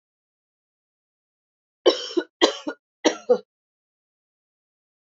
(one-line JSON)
{"three_cough_length": "5.1 s", "three_cough_amplitude": 28317, "three_cough_signal_mean_std_ratio": 0.23, "survey_phase": "beta (2021-08-13 to 2022-03-07)", "age": "18-44", "gender": "Female", "wearing_mask": "No", "symptom_cough_any": true, "symptom_runny_or_blocked_nose": true, "symptom_fatigue": true, "symptom_headache": true, "symptom_change_to_sense_of_smell_or_taste": true, "symptom_loss_of_taste": true, "symptom_onset": "3 days", "smoker_status": "Ex-smoker", "respiratory_condition_asthma": false, "respiratory_condition_other": false, "recruitment_source": "Test and Trace", "submission_delay": "2 days", "covid_test_result": "Positive", "covid_test_method": "RT-qPCR", "covid_ct_value": 33.8, "covid_ct_gene": "ORF1ab gene"}